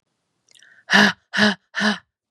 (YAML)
exhalation_length: 2.3 s
exhalation_amplitude: 31832
exhalation_signal_mean_std_ratio: 0.4
survey_phase: beta (2021-08-13 to 2022-03-07)
age: 18-44
gender: Female
wearing_mask: 'No'
symptom_cough_any: true
symptom_runny_or_blocked_nose: true
symptom_sore_throat: true
symptom_fatigue: true
symptom_other: true
symptom_onset: 3 days
smoker_status: Never smoked
respiratory_condition_asthma: false
respiratory_condition_other: false
recruitment_source: Test and Trace
submission_delay: 2 days
covid_test_result: Positive
covid_test_method: RT-qPCR